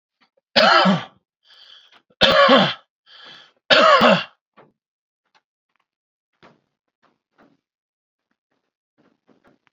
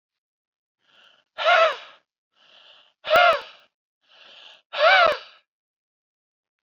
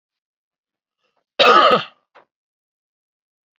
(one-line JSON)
{"three_cough_length": "9.7 s", "three_cough_amplitude": 31384, "three_cough_signal_mean_std_ratio": 0.32, "exhalation_length": "6.7 s", "exhalation_amplitude": 21474, "exhalation_signal_mean_std_ratio": 0.32, "cough_length": "3.6 s", "cough_amplitude": 28794, "cough_signal_mean_std_ratio": 0.28, "survey_phase": "beta (2021-08-13 to 2022-03-07)", "age": "18-44", "gender": "Male", "wearing_mask": "No", "symptom_none": true, "smoker_status": "Current smoker (e-cigarettes or vapes only)", "respiratory_condition_asthma": false, "respiratory_condition_other": false, "recruitment_source": "REACT", "submission_delay": "7 days", "covid_test_result": "Negative", "covid_test_method": "RT-qPCR", "influenza_a_test_result": "Negative", "influenza_b_test_result": "Negative"}